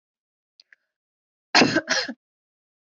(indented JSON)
{
  "cough_length": "3.0 s",
  "cough_amplitude": 24012,
  "cough_signal_mean_std_ratio": 0.28,
  "survey_phase": "alpha (2021-03-01 to 2021-08-12)",
  "age": "18-44",
  "gender": "Female",
  "wearing_mask": "No",
  "symptom_none": true,
  "smoker_status": "Ex-smoker",
  "respiratory_condition_asthma": false,
  "respiratory_condition_other": false,
  "recruitment_source": "REACT",
  "submission_delay": "1 day",
  "covid_test_result": "Negative",
  "covid_test_method": "RT-qPCR"
}